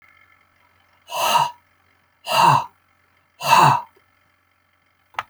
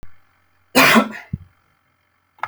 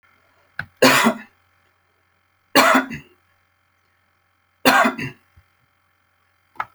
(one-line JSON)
{"exhalation_length": "5.3 s", "exhalation_amplitude": 27189, "exhalation_signal_mean_std_ratio": 0.37, "cough_length": "2.5 s", "cough_amplitude": 32767, "cough_signal_mean_std_ratio": 0.33, "three_cough_length": "6.7 s", "three_cough_amplitude": 32767, "three_cough_signal_mean_std_ratio": 0.31, "survey_phase": "alpha (2021-03-01 to 2021-08-12)", "age": "45-64", "gender": "Male", "wearing_mask": "No", "symptom_none": true, "smoker_status": "Never smoked", "respiratory_condition_asthma": false, "respiratory_condition_other": false, "recruitment_source": "REACT", "submission_delay": "2 days", "covid_test_result": "Negative", "covid_test_method": "RT-qPCR"}